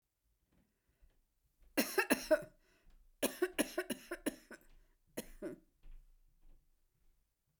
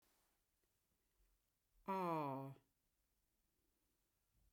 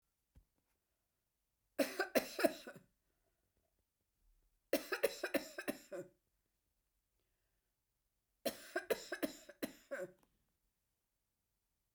{"cough_length": "7.6 s", "cough_amplitude": 5258, "cough_signal_mean_std_ratio": 0.3, "exhalation_length": "4.5 s", "exhalation_amplitude": 759, "exhalation_signal_mean_std_ratio": 0.32, "three_cough_length": "11.9 s", "three_cough_amplitude": 4489, "three_cough_signal_mean_std_ratio": 0.28, "survey_phase": "beta (2021-08-13 to 2022-03-07)", "age": "65+", "gender": "Female", "wearing_mask": "No", "symptom_none": true, "smoker_status": "Never smoked", "respiratory_condition_asthma": true, "respiratory_condition_other": false, "recruitment_source": "REACT", "submission_delay": "1 day", "covid_test_result": "Negative", "covid_test_method": "RT-qPCR"}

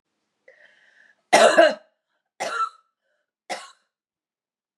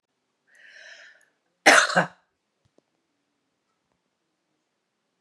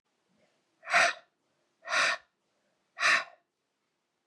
{"three_cough_length": "4.8 s", "three_cough_amplitude": 26928, "three_cough_signal_mean_std_ratio": 0.28, "cough_length": "5.2 s", "cough_amplitude": 28200, "cough_signal_mean_std_ratio": 0.2, "exhalation_length": "4.3 s", "exhalation_amplitude": 10439, "exhalation_signal_mean_std_ratio": 0.33, "survey_phase": "beta (2021-08-13 to 2022-03-07)", "age": "45-64", "gender": "Female", "wearing_mask": "No", "symptom_cough_any": true, "symptom_runny_or_blocked_nose": true, "symptom_sore_throat": true, "symptom_fatigue": true, "symptom_headache": true, "symptom_change_to_sense_of_smell_or_taste": true, "symptom_loss_of_taste": true, "symptom_onset": "4 days", "smoker_status": "Never smoked", "respiratory_condition_asthma": false, "respiratory_condition_other": false, "recruitment_source": "Test and Trace", "submission_delay": "1 day", "covid_test_result": "Positive", "covid_test_method": "RT-qPCR", "covid_ct_value": 27.8, "covid_ct_gene": "ORF1ab gene", "covid_ct_mean": 28.1, "covid_viral_load": "590 copies/ml", "covid_viral_load_category": "Minimal viral load (< 10K copies/ml)"}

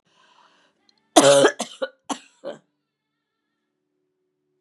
{"cough_length": "4.6 s", "cough_amplitude": 32768, "cough_signal_mean_std_ratio": 0.25, "survey_phase": "beta (2021-08-13 to 2022-03-07)", "age": "45-64", "gender": "Female", "wearing_mask": "No", "symptom_cough_any": true, "symptom_runny_or_blocked_nose": true, "symptom_fatigue": true, "symptom_onset": "2 days", "smoker_status": "Ex-smoker", "respiratory_condition_asthma": false, "respiratory_condition_other": false, "recruitment_source": "Test and Trace", "submission_delay": "1 day", "covid_test_result": "Positive", "covid_test_method": "RT-qPCR", "covid_ct_value": 21.3, "covid_ct_gene": "N gene"}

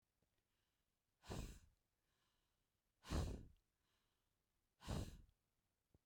{"exhalation_length": "6.1 s", "exhalation_amplitude": 687, "exhalation_signal_mean_std_ratio": 0.31, "survey_phase": "beta (2021-08-13 to 2022-03-07)", "age": "18-44", "gender": "Female", "wearing_mask": "No", "symptom_runny_or_blocked_nose": true, "symptom_sore_throat": true, "symptom_fatigue": true, "symptom_headache": true, "symptom_change_to_sense_of_smell_or_taste": true, "smoker_status": "Current smoker (1 to 10 cigarettes per day)", "respiratory_condition_asthma": false, "respiratory_condition_other": false, "recruitment_source": "Test and Trace", "submission_delay": "2 days", "covid_test_result": "Positive", "covid_test_method": "RT-qPCR", "covid_ct_value": 35.1, "covid_ct_gene": "N gene"}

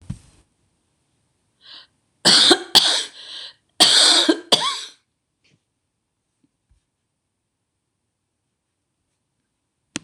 {"three_cough_length": "10.0 s", "three_cough_amplitude": 26028, "three_cough_signal_mean_std_ratio": 0.3, "survey_phase": "beta (2021-08-13 to 2022-03-07)", "age": "65+", "gender": "Female", "wearing_mask": "No", "symptom_none": true, "smoker_status": "Never smoked", "respiratory_condition_asthma": false, "respiratory_condition_other": false, "recruitment_source": "REACT", "submission_delay": "1 day", "covid_test_result": "Negative", "covid_test_method": "RT-qPCR"}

